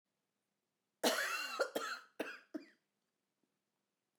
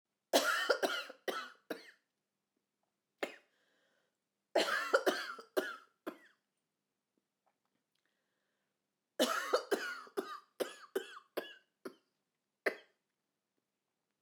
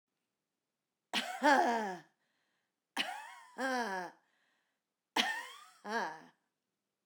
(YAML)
cough_length: 4.2 s
cough_amplitude: 3235
cough_signal_mean_std_ratio: 0.38
three_cough_length: 14.2 s
three_cough_amplitude: 6426
three_cough_signal_mean_std_ratio: 0.34
exhalation_length: 7.1 s
exhalation_amplitude: 6777
exhalation_signal_mean_std_ratio: 0.4
survey_phase: beta (2021-08-13 to 2022-03-07)
age: 45-64
gender: Female
wearing_mask: 'No'
symptom_cough_any: true
symptom_runny_or_blocked_nose: true
symptom_sore_throat: true
symptom_fatigue: true
symptom_onset: 6 days
smoker_status: Never smoked
respiratory_condition_asthma: false
respiratory_condition_other: false
recruitment_source: Test and Trace
submission_delay: 1 day
covid_test_result: Negative
covid_test_method: RT-qPCR